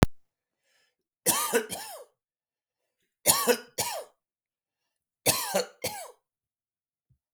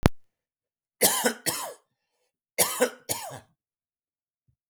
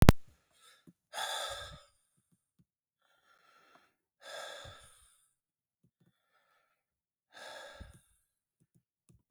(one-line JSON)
{"three_cough_length": "7.3 s", "three_cough_amplitude": 32768, "three_cough_signal_mean_std_ratio": 0.33, "cough_length": "4.7 s", "cough_amplitude": 32768, "cough_signal_mean_std_ratio": 0.34, "exhalation_length": "9.3 s", "exhalation_amplitude": 32768, "exhalation_signal_mean_std_ratio": 0.17, "survey_phase": "beta (2021-08-13 to 2022-03-07)", "age": "45-64", "gender": "Male", "wearing_mask": "No", "symptom_none": true, "smoker_status": "Ex-smoker", "respiratory_condition_asthma": false, "respiratory_condition_other": false, "recruitment_source": "REACT", "submission_delay": "21 days", "covid_test_result": "Negative", "covid_test_method": "RT-qPCR", "influenza_a_test_result": "Negative", "influenza_b_test_result": "Negative"}